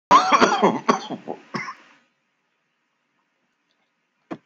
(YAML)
cough_length: 4.5 s
cough_amplitude: 28522
cough_signal_mean_std_ratio: 0.34
survey_phase: beta (2021-08-13 to 2022-03-07)
age: 45-64
gender: Male
wearing_mask: 'No'
symptom_cough_any: true
symptom_runny_or_blocked_nose: true
symptom_shortness_of_breath: true
symptom_sore_throat: true
symptom_fatigue: true
symptom_fever_high_temperature: true
symptom_headache: true
smoker_status: Never smoked
respiratory_condition_asthma: false
respiratory_condition_other: false
recruitment_source: Test and Trace
submission_delay: 1 day
covid_test_result: Positive
covid_test_method: RT-qPCR